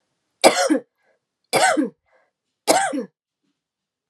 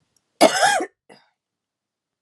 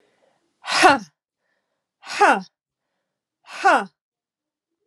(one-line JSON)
{"three_cough_length": "4.1 s", "three_cough_amplitude": 32767, "three_cough_signal_mean_std_ratio": 0.38, "cough_length": "2.2 s", "cough_amplitude": 32107, "cough_signal_mean_std_ratio": 0.32, "exhalation_length": "4.9 s", "exhalation_amplitude": 32767, "exhalation_signal_mean_std_ratio": 0.3, "survey_phase": "alpha (2021-03-01 to 2021-08-12)", "age": "45-64", "gender": "Female", "wearing_mask": "No", "symptom_cough_any": true, "symptom_headache": true, "symptom_onset": "2 days", "smoker_status": "Never smoked", "respiratory_condition_asthma": false, "respiratory_condition_other": false, "recruitment_source": "Test and Trace", "submission_delay": "2 days", "covid_test_result": "Positive", "covid_test_method": "RT-qPCR", "covid_ct_value": 22.0, "covid_ct_gene": "ORF1ab gene"}